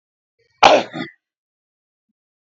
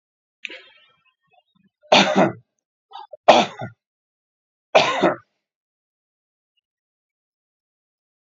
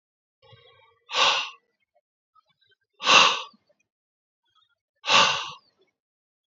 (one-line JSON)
{"cough_length": "2.6 s", "cough_amplitude": 31366, "cough_signal_mean_std_ratio": 0.23, "three_cough_length": "8.3 s", "three_cough_amplitude": 29243, "three_cough_signal_mean_std_ratio": 0.26, "exhalation_length": "6.6 s", "exhalation_amplitude": 24521, "exhalation_signal_mean_std_ratio": 0.3, "survey_phase": "beta (2021-08-13 to 2022-03-07)", "age": "45-64", "gender": "Male", "wearing_mask": "No", "symptom_none": true, "smoker_status": "Never smoked", "respiratory_condition_asthma": true, "respiratory_condition_other": true, "recruitment_source": "REACT", "submission_delay": "1 day", "covid_test_result": "Negative", "covid_test_method": "RT-qPCR"}